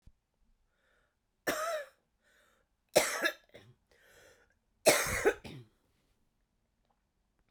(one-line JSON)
{"three_cough_length": "7.5 s", "three_cough_amplitude": 10961, "three_cough_signal_mean_std_ratio": 0.29, "survey_phase": "beta (2021-08-13 to 2022-03-07)", "age": "45-64", "gender": "Female", "wearing_mask": "No", "symptom_cough_any": true, "symptom_runny_or_blocked_nose": true, "symptom_abdominal_pain": true, "symptom_fatigue": true, "symptom_headache": true, "symptom_change_to_sense_of_smell_or_taste": true, "symptom_loss_of_taste": true, "symptom_onset": "5 days", "smoker_status": "Never smoked", "respiratory_condition_asthma": false, "respiratory_condition_other": false, "recruitment_source": "Test and Trace", "submission_delay": "1 day", "covid_test_result": "Positive", "covid_test_method": "RT-qPCR", "covid_ct_value": 19.2, "covid_ct_gene": "ORF1ab gene", "covid_ct_mean": 19.7, "covid_viral_load": "340000 copies/ml", "covid_viral_load_category": "Low viral load (10K-1M copies/ml)"}